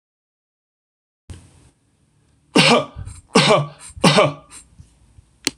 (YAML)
three_cough_length: 5.6 s
three_cough_amplitude: 26028
three_cough_signal_mean_std_ratio: 0.34
survey_phase: beta (2021-08-13 to 2022-03-07)
age: 18-44
gender: Male
wearing_mask: 'No'
symptom_runny_or_blocked_nose: true
symptom_headache: true
smoker_status: Never smoked
respiratory_condition_asthma: false
respiratory_condition_other: false
recruitment_source: REACT
submission_delay: 2 days
covid_test_result: Negative
covid_test_method: RT-qPCR
influenza_a_test_result: Negative
influenza_b_test_result: Negative